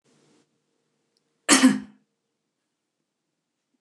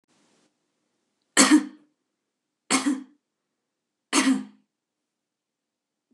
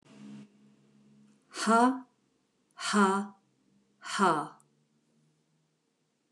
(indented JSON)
{
  "cough_length": "3.8 s",
  "cough_amplitude": 28634,
  "cough_signal_mean_std_ratio": 0.21,
  "three_cough_length": "6.1 s",
  "three_cough_amplitude": 28843,
  "three_cough_signal_mean_std_ratio": 0.27,
  "exhalation_length": "6.3 s",
  "exhalation_amplitude": 9194,
  "exhalation_signal_mean_std_ratio": 0.35,
  "survey_phase": "beta (2021-08-13 to 2022-03-07)",
  "age": "45-64",
  "gender": "Female",
  "wearing_mask": "No",
  "symptom_none": true,
  "smoker_status": "Never smoked",
  "respiratory_condition_asthma": false,
  "respiratory_condition_other": false,
  "recruitment_source": "REACT",
  "submission_delay": "0 days",
  "covid_test_result": "Negative",
  "covid_test_method": "RT-qPCR",
  "influenza_a_test_result": "Negative",
  "influenza_b_test_result": "Negative"
}